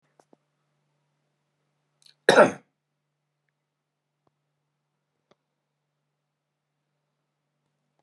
{
  "cough_length": "8.0 s",
  "cough_amplitude": 26198,
  "cough_signal_mean_std_ratio": 0.12,
  "survey_phase": "beta (2021-08-13 to 2022-03-07)",
  "age": "45-64",
  "gender": "Male",
  "wearing_mask": "No",
  "symptom_fatigue": true,
  "smoker_status": "Ex-smoker",
  "respiratory_condition_asthma": false,
  "respiratory_condition_other": false,
  "recruitment_source": "REACT",
  "submission_delay": "1 day",
  "covid_test_result": "Negative",
  "covid_test_method": "RT-qPCR"
}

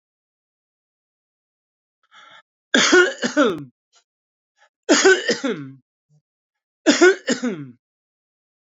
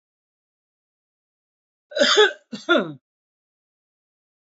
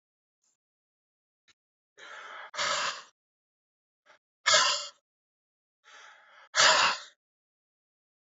{
  "three_cough_length": "8.7 s",
  "three_cough_amplitude": 32373,
  "three_cough_signal_mean_std_ratio": 0.34,
  "cough_length": "4.4 s",
  "cough_amplitude": 25648,
  "cough_signal_mean_std_ratio": 0.27,
  "exhalation_length": "8.4 s",
  "exhalation_amplitude": 12694,
  "exhalation_signal_mean_std_ratio": 0.3,
  "survey_phase": "beta (2021-08-13 to 2022-03-07)",
  "age": "65+",
  "gender": "Male",
  "wearing_mask": "No",
  "symptom_cough_any": true,
  "symptom_runny_or_blocked_nose": true,
  "symptom_fatigue": true,
  "symptom_headache": true,
  "smoker_status": "Ex-smoker",
  "respiratory_condition_asthma": false,
  "respiratory_condition_other": false,
  "recruitment_source": "Test and Trace",
  "submission_delay": "2 days",
  "covid_test_result": "Positive",
  "covid_test_method": "RT-qPCR"
}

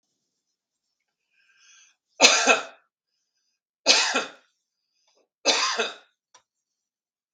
{
  "three_cough_length": "7.3 s",
  "three_cough_amplitude": 32768,
  "three_cough_signal_mean_std_ratio": 0.29,
  "survey_phase": "beta (2021-08-13 to 2022-03-07)",
  "age": "45-64",
  "gender": "Male",
  "wearing_mask": "No",
  "symptom_none": true,
  "smoker_status": "Ex-smoker",
  "respiratory_condition_asthma": false,
  "respiratory_condition_other": false,
  "recruitment_source": "REACT",
  "submission_delay": "1 day",
  "covid_test_result": "Negative",
  "covid_test_method": "RT-qPCR",
  "influenza_a_test_result": "Unknown/Void",
  "influenza_b_test_result": "Unknown/Void"
}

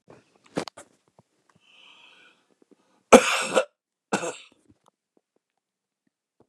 {
  "cough_length": "6.5 s",
  "cough_amplitude": 29204,
  "cough_signal_mean_std_ratio": 0.19,
  "survey_phase": "beta (2021-08-13 to 2022-03-07)",
  "age": "65+",
  "gender": "Male",
  "wearing_mask": "No",
  "symptom_cough_any": true,
  "symptom_onset": "2 days",
  "smoker_status": "Never smoked",
  "respiratory_condition_asthma": false,
  "respiratory_condition_other": false,
  "recruitment_source": "Test and Trace",
  "submission_delay": "1 day",
  "covid_test_result": "Positive",
  "covid_test_method": "RT-qPCR",
  "covid_ct_value": 18.1,
  "covid_ct_gene": "ORF1ab gene",
  "covid_ct_mean": 18.5,
  "covid_viral_load": "880000 copies/ml",
  "covid_viral_load_category": "Low viral load (10K-1M copies/ml)"
}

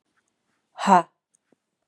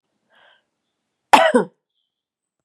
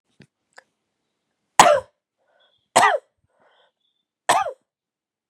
{
  "exhalation_length": "1.9 s",
  "exhalation_amplitude": 28140,
  "exhalation_signal_mean_std_ratio": 0.23,
  "cough_length": "2.6 s",
  "cough_amplitude": 32768,
  "cough_signal_mean_std_ratio": 0.24,
  "three_cough_length": "5.3 s",
  "three_cough_amplitude": 32768,
  "three_cough_signal_mean_std_ratio": 0.25,
  "survey_phase": "beta (2021-08-13 to 2022-03-07)",
  "age": "45-64",
  "gender": "Female",
  "wearing_mask": "No",
  "symptom_runny_or_blocked_nose": true,
  "symptom_headache": true,
  "smoker_status": "Never smoked",
  "respiratory_condition_asthma": false,
  "respiratory_condition_other": false,
  "recruitment_source": "Test and Trace",
  "submission_delay": "1 day",
  "covid_test_result": "Positive",
  "covid_test_method": "LFT"
}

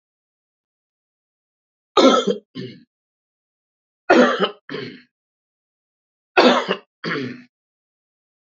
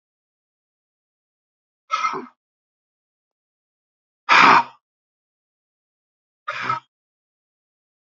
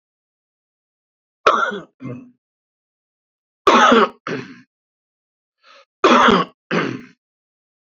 {
  "three_cough_length": "8.4 s",
  "three_cough_amplitude": 28759,
  "three_cough_signal_mean_std_ratio": 0.31,
  "exhalation_length": "8.1 s",
  "exhalation_amplitude": 32767,
  "exhalation_signal_mean_std_ratio": 0.22,
  "cough_length": "7.9 s",
  "cough_amplitude": 32768,
  "cough_signal_mean_std_ratio": 0.34,
  "survey_phase": "beta (2021-08-13 to 2022-03-07)",
  "age": "65+",
  "gender": "Male",
  "wearing_mask": "No",
  "symptom_none": true,
  "smoker_status": "Ex-smoker",
  "respiratory_condition_asthma": false,
  "respiratory_condition_other": false,
  "recruitment_source": "REACT",
  "submission_delay": "2 days",
  "covid_test_result": "Negative",
  "covid_test_method": "RT-qPCR",
  "influenza_a_test_result": "Negative",
  "influenza_b_test_result": "Negative"
}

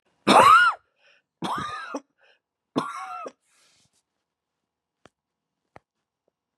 {
  "three_cough_length": "6.6 s",
  "three_cough_amplitude": 24151,
  "three_cough_signal_mean_std_ratio": 0.28,
  "survey_phase": "beta (2021-08-13 to 2022-03-07)",
  "age": "65+",
  "gender": "Female",
  "wearing_mask": "No",
  "symptom_cough_any": true,
  "symptom_runny_or_blocked_nose": true,
  "symptom_shortness_of_breath": true,
  "symptom_sore_throat": true,
  "symptom_diarrhoea": true,
  "symptom_fatigue": true,
  "symptom_headache": true,
  "symptom_other": true,
  "smoker_status": "Ex-smoker",
  "respiratory_condition_asthma": false,
  "respiratory_condition_other": false,
  "recruitment_source": "Test and Trace",
  "submission_delay": "1 day",
  "covid_test_result": "Positive",
  "covid_test_method": "LFT"
}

